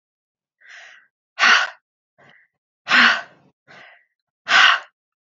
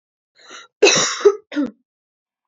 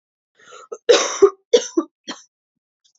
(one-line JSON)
{"exhalation_length": "5.3 s", "exhalation_amplitude": 28137, "exhalation_signal_mean_std_ratio": 0.33, "cough_length": "2.5 s", "cough_amplitude": 30900, "cough_signal_mean_std_ratio": 0.37, "three_cough_length": "3.0 s", "three_cough_amplitude": 28880, "three_cough_signal_mean_std_ratio": 0.31, "survey_phase": "beta (2021-08-13 to 2022-03-07)", "age": "18-44", "gender": "Female", "wearing_mask": "No", "symptom_cough_any": true, "symptom_sore_throat": true, "symptom_fatigue": true, "symptom_fever_high_temperature": true, "symptom_headache": true, "smoker_status": "Never smoked", "respiratory_condition_asthma": false, "respiratory_condition_other": false, "recruitment_source": "Test and Trace", "submission_delay": "2 days", "covid_test_result": "Positive", "covid_test_method": "RT-qPCR", "covid_ct_value": 27.1, "covid_ct_gene": "ORF1ab gene"}